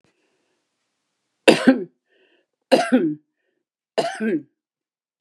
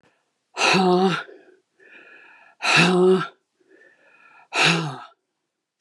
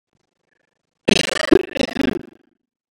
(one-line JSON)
{"three_cough_length": "5.2 s", "three_cough_amplitude": 32768, "three_cough_signal_mean_std_ratio": 0.31, "exhalation_length": "5.8 s", "exhalation_amplitude": 21978, "exhalation_signal_mean_std_ratio": 0.47, "cough_length": "2.9 s", "cough_amplitude": 32767, "cough_signal_mean_std_ratio": 0.3, "survey_phase": "beta (2021-08-13 to 2022-03-07)", "age": "65+", "gender": "Female", "wearing_mask": "No", "symptom_none": true, "smoker_status": "Ex-smoker", "respiratory_condition_asthma": false, "respiratory_condition_other": false, "recruitment_source": "REACT", "submission_delay": "1 day", "covid_test_result": "Negative", "covid_test_method": "RT-qPCR"}